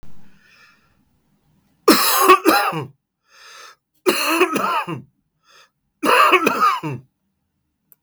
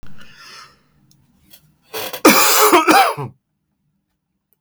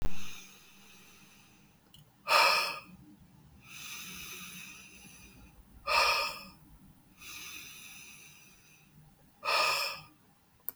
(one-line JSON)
{"three_cough_length": "8.0 s", "three_cough_amplitude": 32768, "three_cough_signal_mean_std_ratio": 0.46, "cough_length": "4.6 s", "cough_amplitude": 32768, "cough_signal_mean_std_ratio": 0.41, "exhalation_length": "10.8 s", "exhalation_amplitude": 8570, "exhalation_signal_mean_std_ratio": 0.42, "survey_phase": "beta (2021-08-13 to 2022-03-07)", "age": "45-64", "gender": "Male", "wearing_mask": "No", "symptom_fatigue": true, "symptom_headache": true, "symptom_change_to_sense_of_smell_or_taste": true, "smoker_status": "Ex-smoker", "respiratory_condition_asthma": false, "respiratory_condition_other": true, "recruitment_source": "Test and Trace", "submission_delay": "0 days", "covid_test_result": "Negative", "covid_test_method": "LFT"}